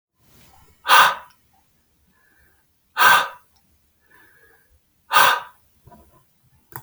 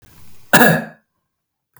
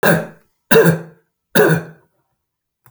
{"exhalation_length": "6.8 s", "exhalation_amplitude": 32768, "exhalation_signal_mean_std_ratio": 0.28, "cough_length": "1.8 s", "cough_amplitude": 32768, "cough_signal_mean_std_ratio": 0.34, "three_cough_length": "2.9 s", "three_cough_amplitude": 32768, "three_cough_signal_mean_std_ratio": 0.42, "survey_phase": "alpha (2021-03-01 to 2021-08-12)", "age": "45-64", "gender": "Male", "wearing_mask": "No", "symptom_fatigue": true, "smoker_status": "Ex-smoker", "respiratory_condition_asthma": false, "respiratory_condition_other": false, "recruitment_source": "Test and Trace", "submission_delay": "1 day", "covid_test_result": "Positive", "covid_test_method": "LFT"}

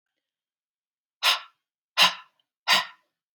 {"exhalation_length": "3.3 s", "exhalation_amplitude": 18495, "exhalation_signal_mean_std_ratio": 0.29, "survey_phase": "beta (2021-08-13 to 2022-03-07)", "age": "45-64", "gender": "Female", "wearing_mask": "No", "symptom_shortness_of_breath": true, "symptom_fatigue": true, "symptom_onset": "12 days", "smoker_status": "Never smoked", "respiratory_condition_asthma": false, "respiratory_condition_other": false, "recruitment_source": "REACT", "submission_delay": "1 day", "covid_test_result": "Negative", "covid_test_method": "RT-qPCR"}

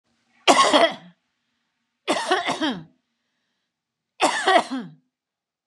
{"three_cough_length": "5.7 s", "three_cough_amplitude": 28628, "three_cough_signal_mean_std_ratio": 0.4, "survey_phase": "beta (2021-08-13 to 2022-03-07)", "age": "45-64", "gender": "Female", "wearing_mask": "No", "symptom_headache": true, "symptom_onset": "13 days", "smoker_status": "Never smoked", "respiratory_condition_asthma": false, "respiratory_condition_other": false, "recruitment_source": "REACT", "submission_delay": "1 day", "covid_test_result": "Negative", "covid_test_method": "RT-qPCR"}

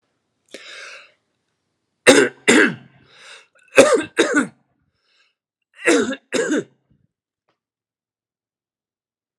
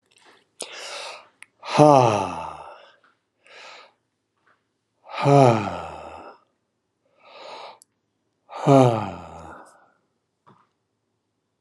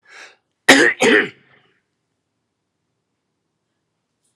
{"three_cough_length": "9.4 s", "three_cough_amplitude": 32768, "three_cough_signal_mean_std_ratio": 0.31, "exhalation_length": "11.6 s", "exhalation_amplitude": 31146, "exhalation_signal_mean_std_ratio": 0.29, "cough_length": "4.4 s", "cough_amplitude": 32768, "cough_signal_mean_std_ratio": 0.27, "survey_phase": "alpha (2021-03-01 to 2021-08-12)", "age": "65+", "gender": "Male", "wearing_mask": "No", "symptom_none": true, "smoker_status": "Never smoked", "respiratory_condition_asthma": true, "respiratory_condition_other": false, "recruitment_source": "REACT", "submission_delay": "2 days", "covid_test_result": "Negative", "covid_test_method": "RT-qPCR"}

